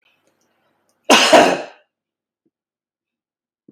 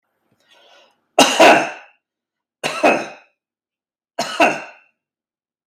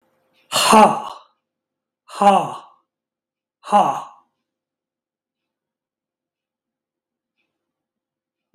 {
  "cough_length": "3.7 s",
  "cough_amplitude": 32768,
  "cough_signal_mean_std_ratio": 0.28,
  "three_cough_length": "5.7 s",
  "three_cough_amplitude": 32768,
  "three_cough_signal_mean_std_ratio": 0.33,
  "exhalation_length": "8.5 s",
  "exhalation_amplitude": 32767,
  "exhalation_signal_mean_std_ratio": 0.26,
  "survey_phase": "beta (2021-08-13 to 2022-03-07)",
  "age": "45-64",
  "gender": "Male",
  "wearing_mask": "No",
  "symptom_none": true,
  "smoker_status": "Ex-smoker",
  "respiratory_condition_asthma": false,
  "respiratory_condition_other": false,
  "recruitment_source": "REACT",
  "submission_delay": "1 day",
  "covid_test_result": "Negative",
  "covid_test_method": "RT-qPCR"
}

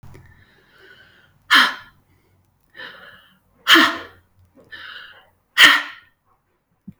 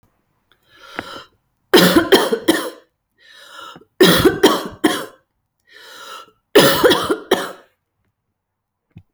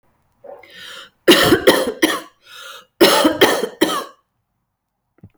{
  "exhalation_length": "7.0 s",
  "exhalation_amplitude": 32767,
  "exhalation_signal_mean_std_ratio": 0.28,
  "three_cough_length": "9.1 s",
  "three_cough_amplitude": 32015,
  "three_cough_signal_mean_std_ratio": 0.4,
  "cough_length": "5.4 s",
  "cough_amplitude": 32768,
  "cough_signal_mean_std_ratio": 0.43,
  "survey_phase": "alpha (2021-03-01 to 2021-08-12)",
  "age": "45-64",
  "gender": "Female",
  "wearing_mask": "No",
  "symptom_none": true,
  "smoker_status": "Never smoked",
  "respiratory_condition_asthma": false,
  "respiratory_condition_other": false,
  "recruitment_source": "REACT",
  "submission_delay": "2 days",
  "covid_test_result": "Negative",
  "covid_test_method": "RT-qPCR"
}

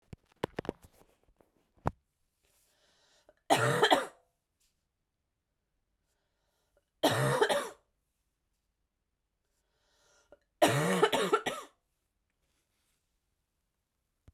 {
  "three_cough_length": "14.3 s",
  "three_cough_amplitude": 10557,
  "three_cough_signal_mean_std_ratio": 0.29,
  "survey_phase": "beta (2021-08-13 to 2022-03-07)",
  "age": "18-44",
  "gender": "Female",
  "wearing_mask": "No",
  "symptom_cough_any": true,
  "symptom_new_continuous_cough": true,
  "symptom_fatigue": true,
  "symptom_fever_high_temperature": true,
  "symptom_change_to_sense_of_smell_or_taste": true,
  "symptom_onset": "5 days",
  "smoker_status": "Never smoked",
  "respiratory_condition_asthma": false,
  "respiratory_condition_other": false,
  "recruitment_source": "Test and Trace",
  "submission_delay": "2 days",
  "covid_test_result": "Positive",
  "covid_test_method": "RT-qPCR"
}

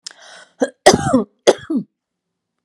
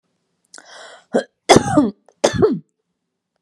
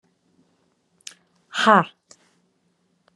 {
  "cough_length": "2.6 s",
  "cough_amplitude": 32768,
  "cough_signal_mean_std_ratio": 0.35,
  "three_cough_length": "3.4 s",
  "three_cough_amplitude": 32768,
  "three_cough_signal_mean_std_ratio": 0.36,
  "exhalation_length": "3.2 s",
  "exhalation_amplitude": 28698,
  "exhalation_signal_mean_std_ratio": 0.2,
  "survey_phase": "beta (2021-08-13 to 2022-03-07)",
  "age": "45-64",
  "gender": "Female",
  "wearing_mask": "No",
  "symptom_none": true,
  "smoker_status": "Ex-smoker",
  "respiratory_condition_asthma": false,
  "respiratory_condition_other": false,
  "recruitment_source": "REACT",
  "submission_delay": "1 day",
  "covid_test_result": "Negative",
  "covid_test_method": "RT-qPCR",
  "influenza_a_test_result": "Negative",
  "influenza_b_test_result": "Negative"
}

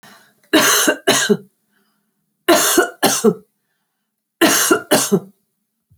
{
  "three_cough_length": "6.0 s",
  "three_cough_amplitude": 32601,
  "three_cough_signal_mean_std_ratio": 0.49,
  "survey_phase": "alpha (2021-03-01 to 2021-08-12)",
  "age": "45-64",
  "gender": "Female",
  "wearing_mask": "No",
  "symptom_none": true,
  "smoker_status": "Never smoked",
  "respiratory_condition_asthma": false,
  "respiratory_condition_other": false,
  "recruitment_source": "REACT",
  "submission_delay": "5 days",
  "covid_test_result": "Negative",
  "covid_test_method": "RT-qPCR"
}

